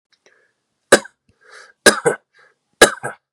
{"three_cough_length": "3.3 s", "three_cough_amplitude": 32768, "three_cough_signal_mean_std_ratio": 0.24, "survey_phase": "beta (2021-08-13 to 2022-03-07)", "age": "18-44", "gender": "Male", "wearing_mask": "No", "symptom_runny_or_blocked_nose": true, "smoker_status": "Never smoked", "respiratory_condition_asthma": true, "respiratory_condition_other": false, "recruitment_source": "Test and Trace", "submission_delay": "2 days", "covid_test_result": "Positive", "covid_test_method": "RT-qPCR", "covid_ct_value": 29.6, "covid_ct_gene": "ORF1ab gene"}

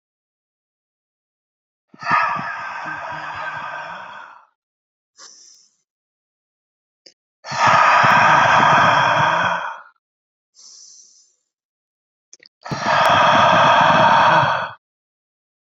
{"exhalation_length": "15.6 s", "exhalation_amplitude": 27378, "exhalation_signal_mean_std_ratio": 0.49, "survey_phase": "beta (2021-08-13 to 2022-03-07)", "age": "18-44", "gender": "Male", "wearing_mask": "No", "symptom_cough_any": true, "symptom_runny_or_blocked_nose": true, "symptom_diarrhoea": true, "symptom_fatigue": true, "symptom_headache": true, "symptom_onset": "5 days", "smoker_status": "Ex-smoker", "respiratory_condition_asthma": false, "respiratory_condition_other": false, "recruitment_source": "Test and Trace", "submission_delay": "2 days", "covid_test_result": "Positive", "covid_test_method": "RT-qPCR", "covid_ct_value": 12.2, "covid_ct_gene": "N gene", "covid_ct_mean": 12.5, "covid_viral_load": "79000000 copies/ml", "covid_viral_load_category": "High viral load (>1M copies/ml)"}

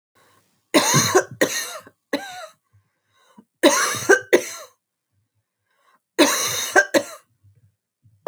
{"three_cough_length": "8.3 s", "three_cough_amplitude": 31661, "three_cough_signal_mean_std_ratio": 0.38, "survey_phase": "alpha (2021-03-01 to 2021-08-12)", "age": "18-44", "gender": "Female", "wearing_mask": "No", "symptom_none": true, "symptom_onset": "11 days", "smoker_status": "Never smoked", "respiratory_condition_asthma": false, "respiratory_condition_other": false, "recruitment_source": "REACT", "submission_delay": "2 days", "covid_test_result": "Negative", "covid_test_method": "RT-qPCR"}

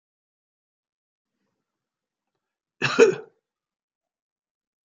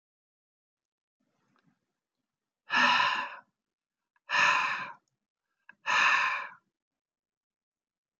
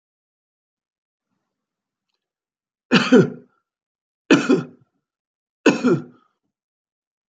{"cough_length": "4.9 s", "cough_amplitude": 24061, "cough_signal_mean_std_ratio": 0.17, "exhalation_length": "8.2 s", "exhalation_amplitude": 8740, "exhalation_signal_mean_std_ratio": 0.37, "three_cough_length": "7.3 s", "three_cough_amplitude": 28740, "three_cough_signal_mean_std_ratio": 0.27, "survey_phase": "alpha (2021-03-01 to 2021-08-12)", "age": "45-64", "gender": "Male", "wearing_mask": "No", "symptom_none": true, "smoker_status": "Never smoked", "respiratory_condition_asthma": false, "respiratory_condition_other": false, "recruitment_source": "REACT", "submission_delay": "3 days", "covid_test_result": "Negative", "covid_test_method": "RT-qPCR"}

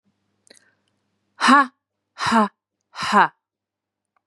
{"exhalation_length": "4.3 s", "exhalation_amplitude": 29532, "exhalation_signal_mean_std_ratio": 0.32, "survey_phase": "beta (2021-08-13 to 2022-03-07)", "age": "18-44", "gender": "Female", "wearing_mask": "No", "symptom_none": true, "smoker_status": "Never smoked", "respiratory_condition_asthma": false, "respiratory_condition_other": false, "recruitment_source": "REACT", "submission_delay": "2 days", "covid_test_result": "Negative", "covid_test_method": "RT-qPCR", "influenza_a_test_result": "Negative", "influenza_b_test_result": "Negative"}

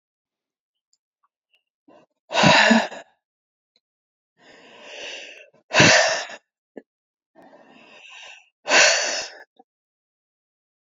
{"exhalation_length": "10.9 s", "exhalation_amplitude": 28493, "exhalation_signal_mean_std_ratio": 0.31, "survey_phase": "alpha (2021-03-01 to 2021-08-12)", "age": "65+", "gender": "Female", "wearing_mask": "No", "symptom_none": true, "smoker_status": "Never smoked", "respiratory_condition_asthma": false, "respiratory_condition_other": false, "recruitment_source": "REACT", "submission_delay": "5 days", "covid_test_result": "Negative", "covid_test_method": "RT-qPCR"}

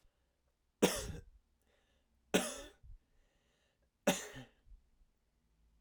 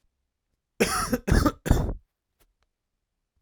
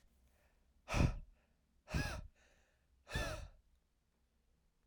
{"three_cough_length": "5.8 s", "three_cough_amplitude": 5960, "three_cough_signal_mean_std_ratio": 0.26, "cough_length": "3.4 s", "cough_amplitude": 18070, "cough_signal_mean_std_ratio": 0.37, "exhalation_length": "4.9 s", "exhalation_amplitude": 2899, "exhalation_signal_mean_std_ratio": 0.34, "survey_phase": "alpha (2021-03-01 to 2021-08-12)", "age": "18-44", "gender": "Male", "wearing_mask": "No", "symptom_fatigue": true, "symptom_fever_high_temperature": true, "symptom_change_to_sense_of_smell_or_taste": true, "symptom_onset": "3 days", "smoker_status": "Ex-smoker", "respiratory_condition_asthma": false, "respiratory_condition_other": false, "recruitment_source": "Test and Trace", "submission_delay": "1 day", "covid_test_result": "Positive", "covid_test_method": "RT-qPCR"}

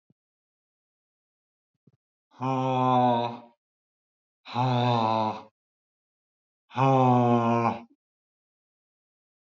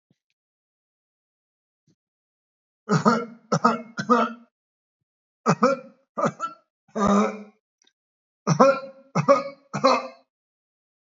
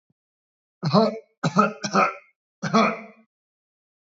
{"exhalation_length": "9.5 s", "exhalation_amplitude": 9619, "exhalation_signal_mean_std_ratio": 0.46, "three_cough_length": "11.2 s", "three_cough_amplitude": 22491, "three_cough_signal_mean_std_ratio": 0.36, "cough_length": "4.0 s", "cough_amplitude": 21247, "cough_signal_mean_std_ratio": 0.41, "survey_phase": "beta (2021-08-13 to 2022-03-07)", "age": "65+", "gender": "Male", "wearing_mask": "No", "symptom_none": true, "smoker_status": "Never smoked", "respiratory_condition_asthma": false, "respiratory_condition_other": false, "recruitment_source": "REACT", "submission_delay": "2 days", "covid_test_result": "Negative", "covid_test_method": "RT-qPCR", "influenza_a_test_result": "Unknown/Void", "influenza_b_test_result": "Unknown/Void"}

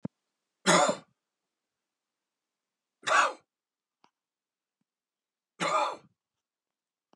{"three_cough_length": "7.2 s", "three_cough_amplitude": 10694, "three_cough_signal_mean_std_ratio": 0.27, "survey_phase": "beta (2021-08-13 to 2022-03-07)", "age": "45-64", "gender": "Male", "wearing_mask": "No", "symptom_headache": true, "symptom_change_to_sense_of_smell_or_taste": true, "symptom_loss_of_taste": true, "symptom_other": true, "symptom_onset": "4 days", "smoker_status": "Ex-smoker", "respiratory_condition_asthma": false, "respiratory_condition_other": false, "recruitment_source": "Test and Trace", "submission_delay": "2 days", "covid_test_result": "Positive", "covid_test_method": "ePCR"}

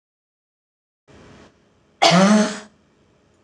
{"cough_length": "3.4 s", "cough_amplitude": 26028, "cough_signal_mean_std_ratio": 0.34, "survey_phase": "alpha (2021-03-01 to 2021-08-12)", "age": "45-64", "gender": "Female", "wearing_mask": "No", "symptom_none": true, "smoker_status": "Ex-smoker", "respiratory_condition_asthma": false, "respiratory_condition_other": false, "recruitment_source": "REACT", "submission_delay": "1 day", "covid_test_result": "Negative", "covid_test_method": "RT-qPCR"}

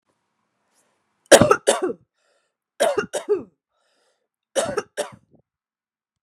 {"three_cough_length": "6.2 s", "three_cough_amplitude": 32768, "three_cough_signal_mean_std_ratio": 0.28, "survey_phase": "beta (2021-08-13 to 2022-03-07)", "age": "18-44", "gender": "Female", "wearing_mask": "No", "symptom_runny_or_blocked_nose": true, "symptom_onset": "3 days", "smoker_status": "Ex-smoker", "respiratory_condition_asthma": false, "respiratory_condition_other": false, "recruitment_source": "REACT", "submission_delay": "3 days", "covid_test_result": "Negative", "covid_test_method": "RT-qPCR", "influenza_a_test_result": "Unknown/Void", "influenza_b_test_result": "Unknown/Void"}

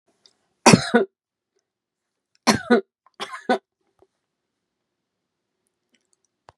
{"three_cough_length": "6.6 s", "three_cough_amplitude": 32768, "three_cough_signal_mean_std_ratio": 0.22, "survey_phase": "beta (2021-08-13 to 2022-03-07)", "age": "65+", "gender": "Female", "wearing_mask": "No", "symptom_none": true, "smoker_status": "Never smoked", "respiratory_condition_asthma": false, "respiratory_condition_other": false, "recruitment_source": "REACT", "submission_delay": "1 day", "covid_test_result": "Negative", "covid_test_method": "RT-qPCR", "influenza_a_test_result": "Negative", "influenza_b_test_result": "Negative"}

